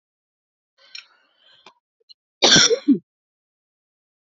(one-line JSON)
{"cough_length": "4.3 s", "cough_amplitude": 31914, "cough_signal_mean_std_ratio": 0.26, "survey_phase": "alpha (2021-03-01 to 2021-08-12)", "age": "45-64", "gender": "Female", "wearing_mask": "No", "symptom_none": true, "smoker_status": "Never smoked", "respiratory_condition_asthma": false, "respiratory_condition_other": false, "recruitment_source": "REACT", "submission_delay": "1 day", "covid_test_result": "Negative", "covid_test_method": "RT-qPCR"}